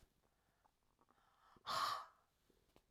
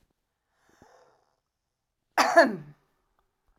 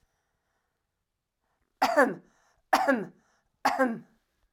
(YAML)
exhalation_length: 2.9 s
exhalation_amplitude: 1139
exhalation_signal_mean_std_ratio: 0.32
cough_length: 3.6 s
cough_amplitude: 17737
cough_signal_mean_std_ratio: 0.23
three_cough_length: 4.5 s
three_cough_amplitude: 11574
three_cough_signal_mean_std_ratio: 0.34
survey_phase: beta (2021-08-13 to 2022-03-07)
age: 45-64
gender: Female
wearing_mask: 'No'
symptom_none: true
smoker_status: Ex-smoker
respiratory_condition_asthma: false
respiratory_condition_other: false
recruitment_source: REACT
submission_delay: 1 day
covid_test_result: Negative
covid_test_method: RT-qPCR